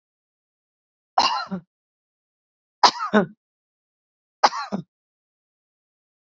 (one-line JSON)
{"three_cough_length": "6.4 s", "three_cough_amplitude": 28762, "three_cough_signal_mean_std_ratio": 0.24, "survey_phase": "beta (2021-08-13 to 2022-03-07)", "age": "45-64", "gender": "Female", "wearing_mask": "No", "symptom_cough_any": true, "symptom_runny_or_blocked_nose": true, "symptom_sore_throat": true, "smoker_status": "Ex-smoker", "respiratory_condition_asthma": false, "respiratory_condition_other": false, "recruitment_source": "REACT", "submission_delay": "1 day", "covid_test_result": "Negative", "covid_test_method": "RT-qPCR", "influenza_a_test_result": "Negative", "influenza_b_test_result": "Negative"}